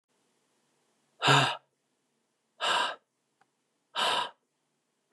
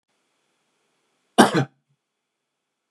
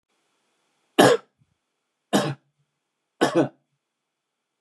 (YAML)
exhalation_length: 5.1 s
exhalation_amplitude: 13665
exhalation_signal_mean_std_ratio: 0.33
cough_length: 2.9 s
cough_amplitude: 29203
cough_signal_mean_std_ratio: 0.2
three_cough_length: 4.6 s
three_cough_amplitude: 28977
three_cough_signal_mean_std_ratio: 0.27
survey_phase: beta (2021-08-13 to 2022-03-07)
age: 45-64
gender: Male
wearing_mask: 'No'
symptom_none: true
smoker_status: Never smoked
respiratory_condition_asthma: false
respiratory_condition_other: false
recruitment_source: REACT
submission_delay: 1 day
covid_test_result: Negative
covid_test_method: RT-qPCR
influenza_a_test_result: Negative
influenza_b_test_result: Negative